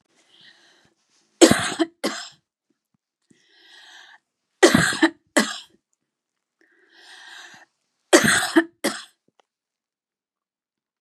{"three_cough_length": "11.0 s", "three_cough_amplitude": 32745, "three_cough_signal_mean_std_ratio": 0.27, "survey_phase": "beta (2021-08-13 to 2022-03-07)", "age": "45-64", "gender": "Female", "wearing_mask": "No", "symptom_new_continuous_cough": true, "symptom_runny_or_blocked_nose": true, "symptom_shortness_of_breath": true, "symptom_diarrhoea": true, "symptom_fatigue": true, "symptom_onset": "2 days", "smoker_status": "Never smoked", "respiratory_condition_asthma": true, "respiratory_condition_other": false, "recruitment_source": "Test and Trace", "submission_delay": "1 day", "covid_test_result": "Positive", "covid_test_method": "RT-qPCR", "covid_ct_value": 24.4, "covid_ct_gene": "N gene"}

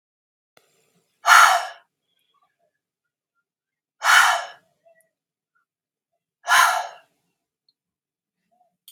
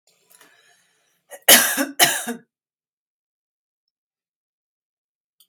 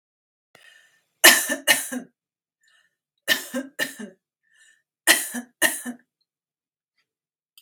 {"exhalation_length": "8.9 s", "exhalation_amplitude": 32757, "exhalation_signal_mean_std_ratio": 0.27, "cough_length": "5.5 s", "cough_amplitude": 32768, "cough_signal_mean_std_ratio": 0.23, "three_cough_length": "7.6 s", "three_cough_amplitude": 32768, "three_cough_signal_mean_std_ratio": 0.27, "survey_phase": "beta (2021-08-13 to 2022-03-07)", "age": "45-64", "gender": "Female", "wearing_mask": "No", "symptom_none": true, "smoker_status": "Ex-smoker", "respiratory_condition_asthma": false, "respiratory_condition_other": false, "recruitment_source": "REACT", "submission_delay": "6 days", "covid_test_result": "Negative", "covid_test_method": "RT-qPCR", "influenza_a_test_result": "Unknown/Void", "influenza_b_test_result": "Unknown/Void"}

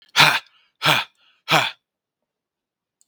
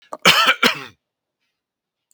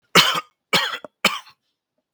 {"exhalation_length": "3.1 s", "exhalation_amplitude": 32768, "exhalation_signal_mean_std_ratio": 0.33, "cough_length": "2.1 s", "cough_amplitude": 32768, "cough_signal_mean_std_ratio": 0.35, "three_cough_length": "2.1 s", "three_cough_amplitude": 32768, "three_cough_signal_mean_std_ratio": 0.37, "survey_phase": "beta (2021-08-13 to 2022-03-07)", "age": "45-64", "gender": "Male", "wearing_mask": "No", "symptom_none": true, "smoker_status": "Never smoked", "respiratory_condition_asthma": false, "respiratory_condition_other": false, "recruitment_source": "REACT", "submission_delay": "2 days", "covid_test_result": "Negative", "covid_test_method": "RT-qPCR"}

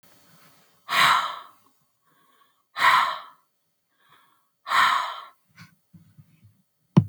{"exhalation_length": "7.1 s", "exhalation_amplitude": 23302, "exhalation_signal_mean_std_ratio": 0.34, "survey_phase": "beta (2021-08-13 to 2022-03-07)", "age": "45-64", "gender": "Female", "wearing_mask": "No", "symptom_none": true, "smoker_status": "Never smoked", "respiratory_condition_asthma": false, "respiratory_condition_other": false, "recruitment_source": "REACT", "submission_delay": "0 days", "covid_test_result": "Negative", "covid_test_method": "RT-qPCR", "influenza_a_test_result": "Negative", "influenza_b_test_result": "Negative"}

